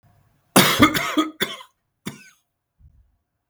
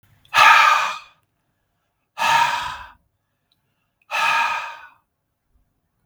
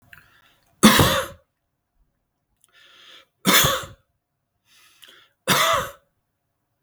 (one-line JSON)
{"cough_length": "3.5 s", "cough_amplitude": 32768, "cough_signal_mean_std_ratio": 0.34, "exhalation_length": "6.1 s", "exhalation_amplitude": 32768, "exhalation_signal_mean_std_ratio": 0.4, "three_cough_length": "6.8 s", "three_cough_amplitude": 32768, "three_cough_signal_mean_std_ratio": 0.32, "survey_phase": "beta (2021-08-13 to 2022-03-07)", "age": "45-64", "gender": "Male", "wearing_mask": "No", "symptom_cough_any": true, "symptom_onset": "12 days", "smoker_status": "Never smoked", "respiratory_condition_asthma": false, "respiratory_condition_other": false, "recruitment_source": "REACT", "submission_delay": "2 days", "covid_test_result": "Negative", "covid_test_method": "RT-qPCR"}